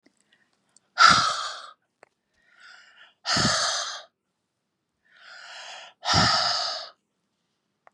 {"exhalation_length": "7.9 s", "exhalation_amplitude": 23390, "exhalation_signal_mean_std_ratio": 0.38, "survey_phase": "beta (2021-08-13 to 2022-03-07)", "age": "45-64", "gender": "Female", "wearing_mask": "No", "symptom_none": true, "smoker_status": "Ex-smoker", "respiratory_condition_asthma": true, "respiratory_condition_other": false, "recruitment_source": "REACT", "submission_delay": "1 day", "covid_test_result": "Negative", "covid_test_method": "RT-qPCR", "influenza_a_test_result": "Unknown/Void", "influenza_b_test_result": "Unknown/Void"}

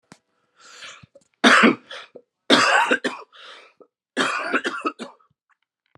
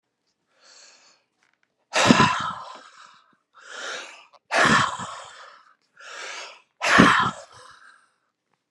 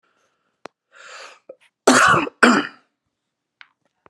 {"three_cough_length": "6.0 s", "three_cough_amplitude": 32096, "three_cough_signal_mean_std_ratio": 0.39, "exhalation_length": "8.7 s", "exhalation_amplitude": 32767, "exhalation_signal_mean_std_ratio": 0.36, "cough_length": "4.1 s", "cough_amplitude": 32289, "cough_signal_mean_std_ratio": 0.32, "survey_phase": "beta (2021-08-13 to 2022-03-07)", "age": "45-64", "gender": "Male", "wearing_mask": "No", "symptom_cough_any": true, "symptom_runny_or_blocked_nose": true, "symptom_shortness_of_breath": true, "symptom_fatigue": true, "symptom_onset": "3 days", "smoker_status": "Ex-smoker", "respiratory_condition_asthma": false, "respiratory_condition_other": false, "recruitment_source": "Test and Trace", "submission_delay": "2 days", "covid_test_result": "Positive", "covid_test_method": "RT-qPCR", "covid_ct_value": 33.6, "covid_ct_gene": "N gene"}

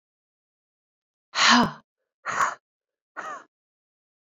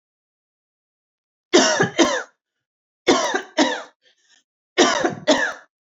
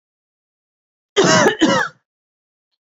{"exhalation_length": "4.4 s", "exhalation_amplitude": 18297, "exhalation_signal_mean_std_ratio": 0.29, "three_cough_length": "6.0 s", "three_cough_amplitude": 30240, "three_cough_signal_mean_std_ratio": 0.42, "cough_length": "2.8 s", "cough_amplitude": 27867, "cough_signal_mean_std_ratio": 0.4, "survey_phase": "beta (2021-08-13 to 2022-03-07)", "age": "18-44", "gender": "Female", "wearing_mask": "No", "symptom_none": true, "smoker_status": "Never smoked", "respiratory_condition_asthma": false, "respiratory_condition_other": false, "recruitment_source": "REACT", "submission_delay": "1 day", "covid_test_result": "Negative", "covid_test_method": "RT-qPCR", "influenza_a_test_result": "Negative", "influenza_b_test_result": "Negative"}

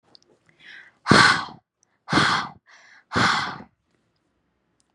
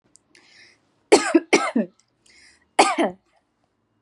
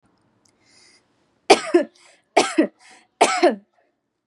{"exhalation_length": "4.9 s", "exhalation_amplitude": 31334, "exhalation_signal_mean_std_ratio": 0.36, "cough_length": "4.0 s", "cough_amplitude": 31961, "cough_signal_mean_std_ratio": 0.32, "three_cough_length": "4.3 s", "three_cough_amplitude": 32767, "three_cough_signal_mean_std_ratio": 0.31, "survey_phase": "beta (2021-08-13 to 2022-03-07)", "age": "18-44", "gender": "Female", "wearing_mask": "No", "symptom_none": true, "smoker_status": "Prefer not to say", "respiratory_condition_asthma": false, "respiratory_condition_other": false, "recruitment_source": "REACT", "submission_delay": "1 day", "covid_test_result": "Negative", "covid_test_method": "RT-qPCR", "influenza_a_test_result": "Negative", "influenza_b_test_result": "Negative"}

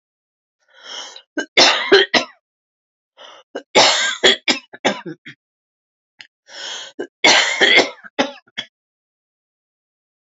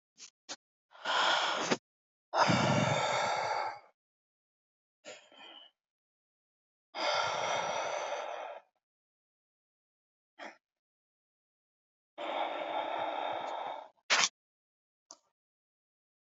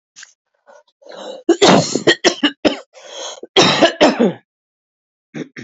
{"three_cough_length": "10.3 s", "three_cough_amplitude": 31323, "three_cough_signal_mean_std_ratio": 0.37, "exhalation_length": "16.2 s", "exhalation_amplitude": 10631, "exhalation_signal_mean_std_ratio": 0.47, "cough_length": "5.6 s", "cough_amplitude": 30019, "cough_signal_mean_std_ratio": 0.43, "survey_phase": "beta (2021-08-13 to 2022-03-07)", "age": "45-64", "gender": "Female", "wearing_mask": "No", "symptom_cough_any": true, "symptom_runny_or_blocked_nose": true, "symptom_diarrhoea": true, "symptom_fatigue": true, "symptom_headache": true, "smoker_status": "Never smoked", "respiratory_condition_asthma": false, "respiratory_condition_other": false, "recruitment_source": "Test and Trace", "submission_delay": "1 day", "covid_test_result": "Positive", "covid_test_method": "LFT"}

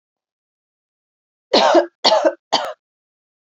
{"three_cough_length": "3.5 s", "three_cough_amplitude": 31719, "three_cough_signal_mean_std_ratio": 0.36, "survey_phase": "beta (2021-08-13 to 2022-03-07)", "age": "18-44", "gender": "Female", "wearing_mask": "No", "symptom_none": true, "smoker_status": "Never smoked", "respiratory_condition_asthma": true, "respiratory_condition_other": false, "recruitment_source": "REACT", "submission_delay": "2 days", "covid_test_result": "Negative", "covid_test_method": "RT-qPCR", "influenza_a_test_result": "Negative", "influenza_b_test_result": "Negative"}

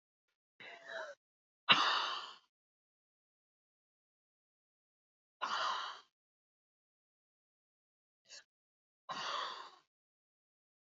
{"exhalation_length": "10.9 s", "exhalation_amplitude": 8850, "exhalation_signal_mean_std_ratio": 0.27, "survey_phase": "beta (2021-08-13 to 2022-03-07)", "age": "18-44", "gender": "Female", "wearing_mask": "No", "symptom_cough_any": true, "symptom_shortness_of_breath": true, "symptom_headache": true, "symptom_change_to_sense_of_smell_or_taste": true, "smoker_status": "Never smoked", "respiratory_condition_asthma": true, "respiratory_condition_other": false, "recruitment_source": "Test and Trace", "submission_delay": "0 days", "covid_test_result": "Positive", "covid_test_method": "RT-qPCR", "covid_ct_value": 15.9, "covid_ct_gene": "S gene", "covid_ct_mean": 16.0, "covid_viral_load": "5500000 copies/ml", "covid_viral_load_category": "High viral load (>1M copies/ml)"}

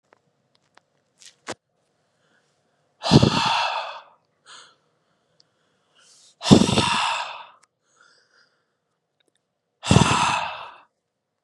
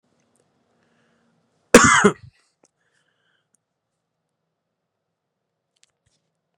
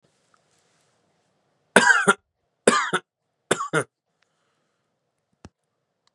{"exhalation_length": "11.4 s", "exhalation_amplitude": 32768, "exhalation_signal_mean_std_ratio": 0.31, "cough_length": "6.6 s", "cough_amplitude": 32768, "cough_signal_mean_std_ratio": 0.17, "three_cough_length": "6.1 s", "three_cough_amplitude": 32768, "three_cough_signal_mean_std_ratio": 0.26, "survey_phase": "beta (2021-08-13 to 2022-03-07)", "age": "18-44", "gender": "Male", "wearing_mask": "No", "symptom_cough_any": true, "symptom_abdominal_pain": true, "symptom_diarrhoea": true, "symptom_change_to_sense_of_smell_or_taste": true, "smoker_status": "Current smoker (1 to 10 cigarettes per day)", "respiratory_condition_asthma": false, "respiratory_condition_other": false, "recruitment_source": "Test and Trace", "submission_delay": "2 days", "covid_test_result": "Positive", "covid_test_method": "RT-qPCR", "covid_ct_value": 20.5, "covid_ct_gene": "N gene", "covid_ct_mean": 20.9, "covid_viral_load": "140000 copies/ml", "covid_viral_load_category": "Low viral load (10K-1M copies/ml)"}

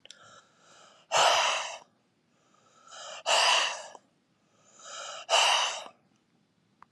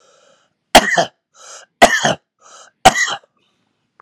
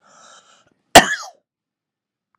{"exhalation_length": "6.9 s", "exhalation_amplitude": 10801, "exhalation_signal_mean_std_ratio": 0.43, "three_cough_length": "4.0 s", "three_cough_amplitude": 32768, "three_cough_signal_mean_std_ratio": 0.32, "cough_length": "2.4 s", "cough_amplitude": 32768, "cough_signal_mean_std_ratio": 0.19, "survey_phase": "alpha (2021-03-01 to 2021-08-12)", "age": "45-64", "gender": "Male", "wearing_mask": "No", "symptom_headache": true, "smoker_status": "Never smoked", "respiratory_condition_asthma": false, "respiratory_condition_other": false, "recruitment_source": "Test and Trace", "submission_delay": "2 days", "covid_test_result": "Positive", "covid_test_method": "RT-qPCR"}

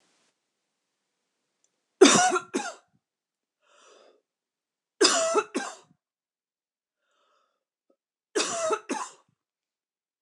{"three_cough_length": "10.2 s", "three_cough_amplitude": 22341, "three_cough_signal_mean_std_ratio": 0.27, "survey_phase": "beta (2021-08-13 to 2022-03-07)", "age": "45-64", "gender": "Female", "wearing_mask": "No", "symptom_none": true, "smoker_status": "Ex-smoker", "respiratory_condition_asthma": false, "respiratory_condition_other": false, "recruitment_source": "REACT", "submission_delay": "0 days", "covid_test_result": "Negative", "covid_test_method": "RT-qPCR"}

